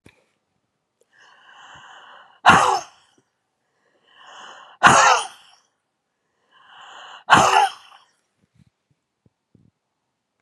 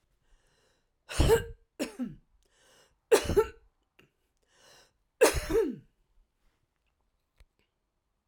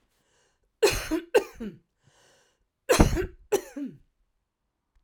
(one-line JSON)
{"exhalation_length": "10.4 s", "exhalation_amplitude": 32767, "exhalation_signal_mean_std_ratio": 0.27, "three_cough_length": "8.3 s", "three_cough_amplitude": 10895, "three_cough_signal_mean_std_ratio": 0.29, "cough_length": "5.0 s", "cough_amplitude": 25100, "cough_signal_mean_std_ratio": 0.33, "survey_phase": "alpha (2021-03-01 to 2021-08-12)", "age": "65+", "gender": "Female", "wearing_mask": "No", "symptom_none": true, "smoker_status": "Ex-smoker", "respiratory_condition_asthma": false, "respiratory_condition_other": false, "recruitment_source": "REACT", "submission_delay": "1 day", "covid_test_result": "Negative", "covid_test_method": "RT-qPCR"}